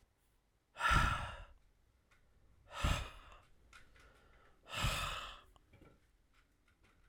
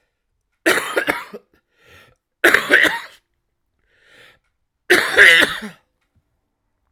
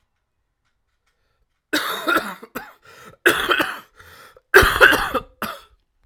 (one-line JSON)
{"exhalation_length": "7.1 s", "exhalation_amplitude": 3758, "exhalation_signal_mean_std_ratio": 0.37, "three_cough_length": "6.9 s", "three_cough_amplitude": 32768, "three_cough_signal_mean_std_ratio": 0.35, "cough_length": "6.1 s", "cough_amplitude": 32768, "cough_signal_mean_std_ratio": 0.37, "survey_phase": "beta (2021-08-13 to 2022-03-07)", "age": "18-44", "gender": "Male", "wearing_mask": "No", "symptom_cough_any": true, "symptom_new_continuous_cough": true, "symptom_runny_or_blocked_nose": true, "symptom_fatigue": true, "symptom_fever_high_temperature": true, "symptom_onset": "2 days", "smoker_status": "Never smoked", "respiratory_condition_asthma": false, "respiratory_condition_other": false, "recruitment_source": "Test and Trace", "submission_delay": "1 day", "covid_test_result": "Positive", "covid_test_method": "RT-qPCR", "covid_ct_value": 30.5, "covid_ct_gene": "ORF1ab gene"}